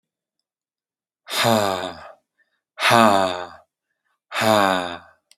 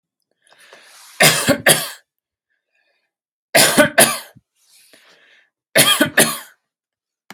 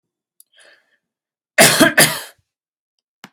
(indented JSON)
{
  "exhalation_length": "5.4 s",
  "exhalation_amplitude": 32683,
  "exhalation_signal_mean_std_ratio": 0.42,
  "three_cough_length": "7.3 s",
  "three_cough_amplitude": 32683,
  "three_cough_signal_mean_std_ratio": 0.36,
  "cough_length": "3.3 s",
  "cough_amplitude": 32683,
  "cough_signal_mean_std_ratio": 0.31,
  "survey_phase": "alpha (2021-03-01 to 2021-08-12)",
  "age": "18-44",
  "gender": "Male",
  "wearing_mask": "No",
  "symptom_none": true,
  "smoker_status": "Never smoked",
  "respiratory_condition_asthma": false,
  "respiratory_condition_other": false,
  "recruitment_source": "REACT",
  "submission_delay": "1 day",
  "covid_test_result": "Negative",
  "covid_test_method": "RT-qPCR"
}